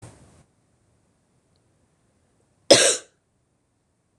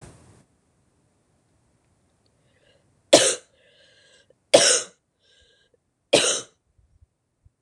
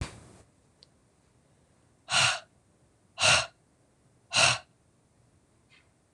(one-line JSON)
{"cough_length": "4.2 s", "cough_amplitude": 26028, "cough_signal_mean_std_ratio": 0.19, "three_cough_length": "7.6 s", "three_cough_amplitude": 26028, "three_cough_signal_mean_std_ratio": 0.23, "exhalation_length": "6.1 s", "exhalation_amplitude": 13322, "exhalation_signal_mean_std_ratio": 0.3, "survey_phase": "beta (2021-08-13 to 2022-03-07)", "age": "18-44", "gender": "Female", "wearing_mask": "No", "symptom_cough_any": true, "symptom_runny_or_blocked_nose": true, "symptom_other": true, "smoker_status": "Ex-smoker", "respiratory_condition_asthma": false, "respiratory_condition_other": false, "recruitment_source": "Test and Trace", "submission_delay": "1 day", "covid_test_result": "Positive", "covid_test_method": "LFT"}